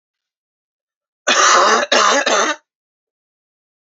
{"cough_length": "3.9 s", "cough_amplitude": 31337, "cough_signal_mean_std_ratio": 0.47, "survey_phase": "beta (2021-08-13 to 2022-03-07)", "age": "45-64", "gender": "Male", "wearing_mask": "No", "symptom_headache": true, "symptom_other": true, "symptom_onset": "5 days", "smoker_status": "Never smoked", "respiratory_condition_asthma": true, "respiratory_condition_other": false, "recruitment_source": "Test and Trace", "submission_delay": "2 days", "covid_test_result": "Positive", "covid_test_method": "RT-qPCR", "covid_ct_value": 28.6, "covid_ct_gene": "N gene"}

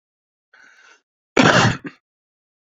{"cough_length": "2.7 s", "cough_amplitude": 28968, "cough_signal_mean_std_ratio": 0.3, "survey_phase": "beta (2021-08-13 to 2022-03-07)", "age": "45-64", "gender": "Male", "wearing_mask": "No", "symptom_none": true, "smoker_status": "Current smoker (e-cigarettes or vapes only)", "respiratory_condition_asthma": true, "respiratory_condition_other": false, "recruitment_source": "REACT", "submission_delay": "1 day", "covid_test_result": "Negative", "covid_test_method": "RT-qPCR"}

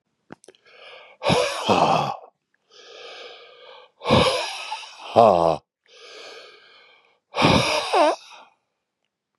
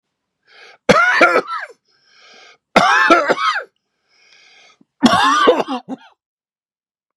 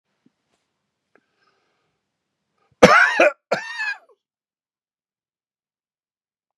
{"exhalation_length": "9.4 s", "exhalation_amplitude": 32019, "exhalation_signal_mean_std_ratio": 0.43, "three_cough_length": "7.2 s", "three_cough_amplitude": 32768, "three_cough_signal_mean_std_ratio": 0.45, "cough_length": "6.6 s", "cough_amplitude": 32768, "cough_signal_mean_std_ratio": 0.23, "survey_phase": "beta (2021-08-13 to 2022-03-07)", "age": "65+", "gender": "Male", "wearing_mask": "No", "symptom_none": true, "symptom_onset": "12 days", "smoker_status": "Never smoked", "respiratory_condition_asthma": false, "respiratory_condition_other": false, "recruitment_source": "REACT", "submission_delay": "1 day", "covid_test_result": "Negative", "covid_test_method": "RT-qPCR", "influenza_a_test_result": "Negative", "influenza_b_test_result": "Negative"}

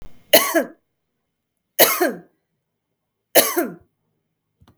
{"three_cough_length": "4.8 s", "three_cough_amplitude": 32768, "three_cough_signal_mean_std_ratio": 0.32, "survey_phase": "beta (2021-08-13 to 2022-03-07)", "age": "45-64", "gender": "Female", "wearing_mask": "No", "symptom_none": true, "smoker_status": "Never smoked", "respiratory_condition_asthma": false, "respiratory_condition_other": false, "recruitment_source": "REACT", "submission_delay": "2 days", "covid_test_result": "Negative", "covid_test_method": "RT-qPCR"}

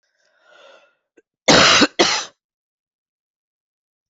{"cough_length": "4.1 s", "cough_amplitude": 32767, "cough_signal_mean_std_ratio": 0.31, "survey_phase": "alpha (2021-03-01 to 2021-08-12)", "age": "45-64", "gender": "Female", "wearing_mask": "No", "symptom_cough_any": true, "symptom_new_continuous_cough": true, "symptom_fatigue": true, "symptom_fever_high_temperature": true, "symptom_headache": true, "symptom_onset": "4 days", "smoker_status": "Never smoked", "respiratory_condition_asthma": false, "respiratory_condition_other": false, "recruitment_source": "Test and Trace", "submission_delay": "2 days", "covid_test_result": "Positive", "covid_test_method": "RT-qPCR"}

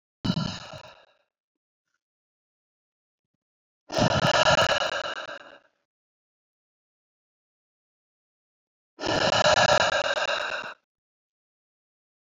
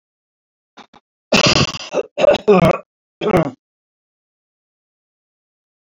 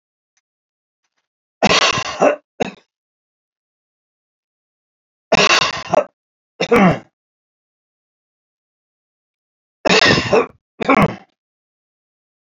{"exhalation_length": "12.4 s", "exhalation_amplitude": 16613, "exhalation_signal_mean_std_ratio": 0.38, "cough_length": "5.8 s", "cough_amplitude": 32363, "cough_signal_mean_std_ratio": 0.35, "three_cough_length": "12.5 s", "three_cough_amplitude": 32767, "three_cough_signal_mean_std_ratio": 0.33, "survey_phase": "beta (2021-08-13 to 2022-03-07)", "age": "65+", "gender": "Male", "wearing_mask": "No", "symptom_none": true, "smoker_status": "Never smoked", "respiratory_condition_asthma": false, "respiratory_condition_other": false, "recruitment_source": "REACT", "submission_delay": "2 days", "covid_test_result": "Negative", "covid_test_method": "RT-qPCR", "influenza_a_test_result": "Negative", "influenza_b_test_result": "Negative"}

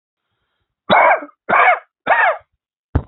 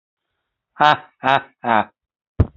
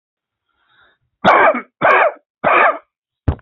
{"cough_length": "3.1 s", "cough_amplitude": 31792, "cough_signal_mean_std_ratio": 0.46, "exhalation_length": "2.6 s", "exhalation_amplitude": 28984, "exhalation_signal_mean_std_ratio": 0.32, "three_cough_length": "3.4 s", "three_cough_amplitude": 29622, "three_cough_signal_mean_std_ratio": 0.46, "survey_phase": "alpha (2021-03-01 to 2021-08-12)", "age": "65+", "gender": "Male", "wearing_mask": "No", "symptom_none": true, "smoker_status": "Ex-smoker", "respiratory_condition_asthma": false, "respiratory_condition_other": false, "recruitment_source": "REACT", "submission_delay": "15 days", "covid_test_result": "Negative", "covid_test_method": "RT-qPCR"}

